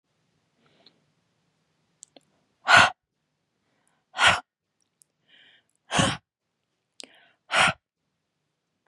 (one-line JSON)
{"exhalation_length": "8.9 s", "exhalation_amplitude": 27108, "exhalation_signal_mean_std_ratio": 0.23, "survey_phase": "beta (2021-08-13 to 2022-03-07)", "age": "18-44", "gender": "Female", "wearing_mask": "No", "symptom_cough_any": true, "symptom_runny_or_blocked_nose": true, "symptom_fatigue": true, "smoker_status": "Never smoked", "respiratory_condition_asthma": false, "respiratory_condition_other": false, "recruitment_source": "REACT", "submission_delay": "2 days", "covid_test_result": "Negative", "covid_test_method": "RT-qPCR", "influenza_a_test_result": "Negative", "influenza_b_test_result": "Negative"}